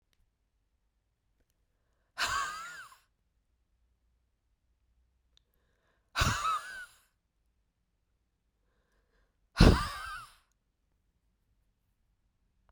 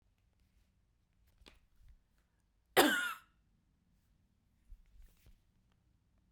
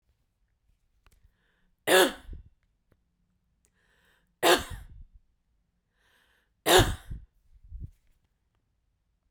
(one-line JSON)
{"exhalation_length": "12.7 s", "exhalation_amplitude": 16082, "exhalation_signal_mean_std_ratio": 0.21, "cough_length": "6.3 s", "cough_amplitude": 7547, "cough_signal_mean_std_ratio": 0.2, "three_cough_length": "9.3 s", "three_cough_amplitude": 17561, "three_cough_signal_mean_std_ratio": 0.24, "survey_phase": "beta (2021-08-13 to 2022-03-07)", "age": "45-64", "gender": "Female", "wearing_mask": "No", "symptom_none": true, "smoker_status": "Never smoked", "respiratory_condition_asthma": false, "respiratory_condition_other": false, "recruitment_source": "REACT", "submission_delay": "1 day", "covid_test_result": "Negative", "covid_test_method": "RT-qPCR"}